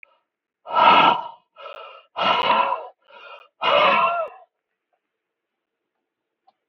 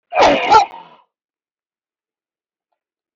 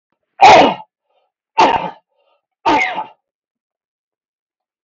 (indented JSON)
{
  "exhalation_length": "6.7 s",
  "exhalation_amplitude": 29148,
  "exhalation_signal_mean_std_ratio": 0.43,
  "cough_length": "3.2 s",
  "cough_amplitude": 32767,
  "cough_signal_mean_std_ratio": 0.34,
  "three_cough_length": "4.8 s",
  "three_cough_amplitude": 32768,
  "three_cough_signal_mean_std_ratio": 0.35,
  "survey_phase": "beta (2021-08-13 to 2022-03-07)",
  "age": "65+",
  "gender": "Male",
  "wearing_mask": "No",
  "symptom_runny_or_blocked_nose": true,
  "smoker_status": "Never smoked",
  "respiratory_condition_asthma": false,
  "respiratory_condition_other": false,
  "recruitment_source": "REACT",
  "submission_delay": "1 day",
  "covid_test_result": "Negative",
  "covid_test_method": "RT-qPCR",
  "influenza_a_test_result": "Negative",
  "influenza_b_test_result": "Negative"
}